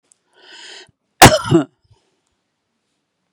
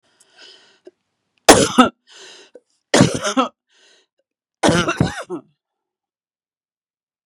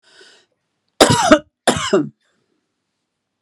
{
  "exhalation_length": "3.3 s",
  "exhalation_amplitude": 32768,
  "exhalation_signal_mean_std_ratio": 0.24,
  "three_cough_length": "7.3 s",
  "three_cough_amplitude": 32768,
  "three_cough_signal_mean_std_ratio": 0.3,
  "cough_length": "3.4 s",
  "cough_amplitude": 32768,
  "cough_signal_mean_std_ratio": 0.33,
  "survey_phase": "beta (2021-08-13 to 2022-03-07)",
  "age": "45-64",
  "gender": "Female",
  "wearing_mask": "No",
  "symptom_none": true,
  "smoker_status": "Never smoked",
  "respiratory_condition_asthma": false,
  "respiratory_condition_other": false,
  "recruitment_source": "REACT",
  "submission_delay": "1 day",
  "covid_test_result": "Negative",
  "covid_test_method": "RT-qPCR",
  "influenza_a_test_result": "Negative",
  "influenza_b_test_result": "Negative"
}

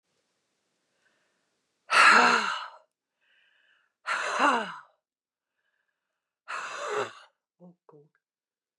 {
  "exhalation_length": "8.8 s",
  "exhalation_amplitude": 16090,
  "exhalation_signal_mean_std_ratio": 0.31,
  "survey_phase": "beta (2021-08-13 to 2022-03-07)",
  "age": "65+",
  "gender": "Female",
  "wearing_mask": "Yes",
  "symptom_new_continuous_cough": true,
  "symptom_shortness_of_breath": true,
  "symptom_abdominal_pain": true,
  "symptom_headache": true,
  "symptom_change_to_sense_of_smell_or_taste": true,
  "symptom_onset": "5 days",
  "smoker_status": "Never smoked",
  "respiratory_condition_asthma": false,
  "respiratory_condition_other": false,
  "recruitment_source": "Test and Trace",
  "submission_delay": "2 days",
  "covid_test_result": "Positive",
  "covid_test_method": "RT-qPCR",
  "covid_ct_value": 19.8,
  "covid_ct_gene": "ORF1ab gene"
}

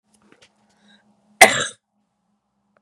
{
  "cough_length": "2.8 s",
  "cough_amplitude": 32768,
  "cough_signal_mean_std_ratio": 0.18,
  "survey_phase": "beta (2021-08-13 to 2022-03-07)",
  "age": "45-64",
  "gender": "Female",
  "wearing_mask": "No",
  "symptom_cough_any": true,
  "symptom_sore_throat": true,
  "symptom_onset": "5 days",
  "smoker_status": "Never smoked",
  "respiratory_condition_asthma": true,
  "respiratory_condition_other": false,
  "recruitment_source": "Test and Trace",
  "submission_delay": "3 days",
  "covid_test_result": "Negative",
  "covid_test_method": "RT-qPCR"
}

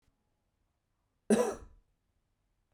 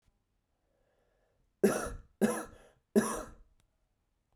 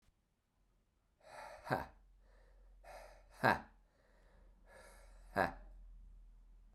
{
  "cough_length": "2.7 s",
  "cough_amplitude": 7024,
  "cough_signal_mean_std_ratio": 0.24,
  "three_cough_length": "4.4 s",
  "three_cough_amplitude": 8465,
  "three_cough_signal_mean_std_ratio": 0.3,
  "exhalation_length": "6.7 s",
  "exhalation_amplitude": 5794,
  "exhalation_signal_mean_std_ratio": 0.29,
  "survey_phase": "beta (2021-08-13 to 2022-03-07)",
  "age": "18-44",
  "gender": "Male",
  "wearing_mask": "No",
  "symptom_cough_any": true,
  "symptom_runny_or_blocked_nose": true,
  "symptom_sore_throat": true,
  "symptom_fatigue": true,
  "symptom_fever_high_temperature": true,
  "symptom_onset": "3 days",
  "smoker_status": "Never smoked",
  "respiratory_condition_asthma": false,
  "respiratory_condition_other": false,
  "recruitment_source": "Test and Trace",
  "submission_delay": "2 days",
  "covid_test_result": "Positive",
  "covid_test_method": "RT-qPCR",
  "covid_ct_value": 19.6,
  "covid_ct_gene": "N gene"
}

